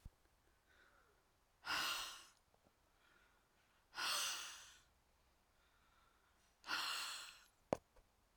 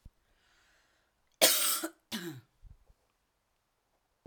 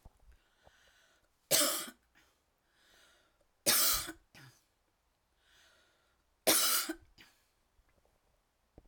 {"exhalation_length": "8.4 s", "exhalation_amplitude": 2848, "exhalation_signal_mean_std_ratio": 0.39, "cough_length": "4.3 s", "cough_amplitude": 13088, "cough_signal_mean_std_ratio": 0.28, "three_cough_length": "8.9 s", "three_cough_amplitude": 8024, "three_cough_signal_mean_std_ratio": 0.3, "survey_phase": "alpha (2021-03-01 to 2021-08-12)", "age": "45-64", "gender": "Female", "wearing_mask": "No", "symptom_none": true, "smoker_status": "Never smoked", "respiratory_condition_asthma": false, "respiratory_condition_other": false, "recruitment_source": "REACT", "submission_delay": "1 day", "covid_test_result": "Negative", "covid_test_method": "RT-qPCR"}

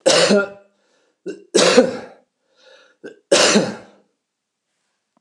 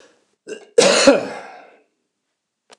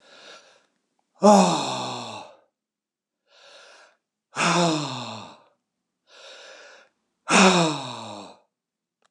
{"three_cough_length": "5.2 s", "three_cough_amplitude": 29204, "three_cough_signal_mean_std_ratio": 0.4, "cough_length": "2.8 s", "cough_amplitude": 29204, "cough_signal_mean_std_ratio": 0.34, "exhalation_length": "9.1 s", "exhalation_amplitude": 23822, "exhalation_signal_mean_std_ratio": 0.36, "survey_phase": "beta (2021-08-13 to 2022-03-07)", "age": "65+", "gender": "Male", "wearing_mask": "No", "symptom_none": true, "smoker_status": "Ex-smoker", "respiratory_condition_asthma": false, "respiratory_condition_other": false, "recruitment_source": "REACT", "submission_delay": "1 day", "covid_test_result": "Negative", "covid_test_method": "RT-qPCR"}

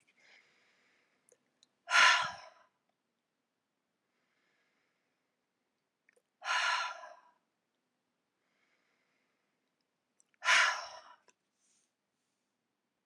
{"exhalation_length": "13.1 s", "exhalation_amplitude": 7989, "exhalation_signal_mean_std_ratio": 0.23, "survey_phase": "alpha (2021-03-01 to 2021-08-12)", "age": "45-64", "gender": "Female", "wearing_mask": "No", "symptom_change_to_sense_of_smell_or_taste": true, "symptom_loss_of_taste": true, "smoker_status": "Never smoked", "respiratory_condition_asthma": false, "respiratory_condition_other": false, "recruitment_source": "Test and Trace", "submission_delay": "2 days", "covid_test_result": "Positive", "covid_test_method": "RT-qPCR"}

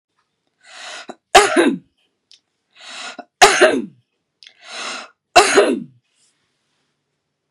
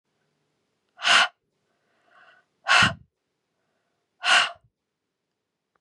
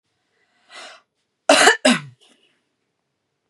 {"three_cough_length": "7.5 s", "three_cough_amplitude": 32768, "three_cough_signal_mean_std_ratio": 0.33, "exhalation_length": "5.8 s", "exhalation_amplitude": 19936, "exhalation_signal_mean_std_ratio": 0.28, "cough_length": "3.5 s", "cough_amplitude": 32756, "cough_signal_mean_std_ratio": 0.28, "survey_phase": "beta (2021-08-13 to 2022-03-07)", "age": "45-64", "gender": "Female", "wearing_mask": "No", "symptom_change_to_sense_of_smell_or_taste": true, "smoker_status": "Ex-smoker", "respiratory_condition_asthma": false, "respiratory_condition_other": false, "recruitment_source": "Test and Trace", "submission_delay": "2 days", "covid_test_result": "Positive", "covid_test_method": "LAMP"}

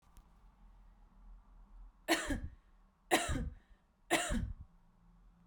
{"three_cough_length": "5.5 s", "three_cough_amplitude": 5681, "three_cough_signal_mean_std_ratio": 0.41, "survey_phase": "beta (2021-08-13 to 2022-03-07)", "age": "18-44", "gender": "Female", "wearing_mask": "No", "symptom_none": true, "smoker_status": "Never smoked", "respiratory_condition_asthma": false, "respiratory_condition_other": false, "recruitment_source": "REACT", "submission_delay": "0 days", "covid_test_result": "Negative", "covid_test_method": "RT-qPCR", "influenza_a_test_result": "Negative", "influenza_b_test_result": "Negative"}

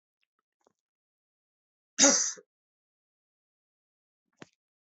{"cough_length": "4.9 s", "cough_amplitude": 16252, "cough_signal_mean_std_ratio": 0.19, "survey_phase": "alpha (2021-03-01 to 2021-08-12)", "age": "18-44", "gender": "Male", "wearing_mask": "No", "symptom_cough_any": true, "symptom_fever_high_temperature": true, "symptom_headache": true, "symptom_onset": "2 days", "smoker_status": "Never smoked", "respiratory_condition_asthma": false, "respiratory_condition_other": false, "recruitment_source": "Test and Trace", "submission_delay": "1 day", "covid_test_result": "Positive", "covid_test_method": "RT-qPCR", "covid_ct_value": 21.2, "covid_ct_gene": "ORF1ab gene", "covid_ct_mean": 21.7, "covid_viral_load": "77000 copies/ml", "covid_viral_load_category": "Low viral load (10K-1M copies/ml)"}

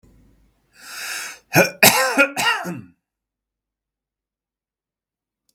{"cough_length": "5.5 s", "cough_amplitude": 32768, "cough_signal_mean_std_ratio": 0.33, "survey_phase": "beta (2021-08-13 to 2022-03-07)", "age": "45-64", "gender": "Male", "wearing_mask": "No", "symptom_none": true, "smoker_status": "Never smoked", "respiratory_condition_asthma": false, "respiratory_condition_other": false, "recruitment_source": "REACT", "submission_delay": "1 day", "covid_test_result": "Negative", "covid_test_method": "RT-qPCR", "influenza_a_test_result": "Negative", "influenza_b_test_result": "Negative"}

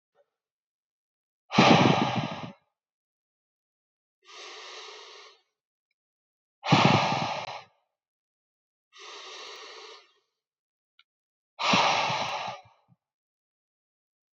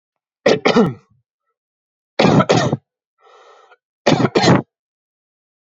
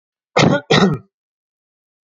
{"exhalation_length": "14.3 s", "exhalation_amplitude": 18105, "exhalation_signal_mean_std_ratio": 0.33, "three_cough_length": "5.7 s", "three_cough_amplitude": 32768, "three_cough_signal_mean_std_ratio": 0.39, "cough_length": "2.0 s", "cough_amplitude": 30636, "cough_signal_mean_std_ratio": 0.4, "survey_phase": "alpha (2021-03-01 to 2021-08-12)", "age": "18-44", "gender": "Male", "wearing_mask": "No", "symptom_none": true, "smoker_status": "Never smoked", "respiratory_condition_asthma": false, "respiratory_condition_other": false, "recruitment_source": "REACT", "submission_delay": "1 day", "covid_test_result": "Negative", "covid_test_method": "RT-qPCR"}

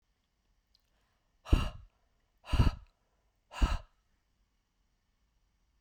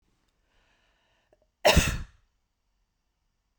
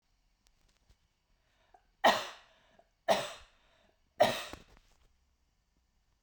{"exhalation_length": "5.8 s", "exhalation_amplitude": 8525, "exhalation_signal_mean_std_ratio": 0.23, "cough_length": "3.6 s", "cough_amplitude": 16107, "cough_signal_mean_std_ratio": 0.23, "three_cough_length": "6.2 s", "three_cough_amplitude": 9171, "three_cough_signal_mean_std_ratio": 0.24, "survey_phase": "beta (2021-08-13 to 2022-03-07)", "age": "18-44", "gender": "Female", "wearing_mask": "No", "symptom_runny_or_blocked_nose": true, "symptom_sore_throat": true, "symptom_headache": true, "smoker_status": "Never smoked", "respiratory_condition_asthma": false, "respiratory_condition_other": false, "recruitment_source": "REACT", "submission_delay": "0 days", "covid_test_result": "Negative", "covid_test_method": "RT-qPCR"}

